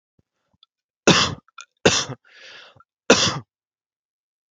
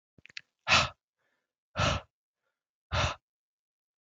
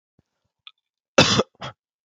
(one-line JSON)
{"three_cough_length": "4.5 s", "three_cough_amplitude": 30395, "three_cough_signal_mean_std_ratio": 0.29, "exhalation_length": "4.0 s", "exhalation_amplitude": 10564, "exhalation_signal_mean_std_ratio": 0.31, "cough_length": "2.0 s", "cough_amplitude": 28707, "cough_signal_mean_std_ratio": 0.27, "survey_phase": "alpha (2021-03-01 to 2021-08-12)", "age": "18-44", "gender": "Male", "wearing_mask": "No", "symptom_cough_any": true, "symptom_fever_high_temperature": true, "symptom_onset": "4 days", "smoker_status": "Never smoked", "respiratory_condition_asthma": false, "respiratory_condition_other": false, "recruitment_source": "Test and Trace", "submission_delay": "1 day", "covid_test_result": "Positive", "covid_test_method": "RT-qPCR", "covid_ct_value": 19.2, "covid_ct_gene": "ORF1ab gene"}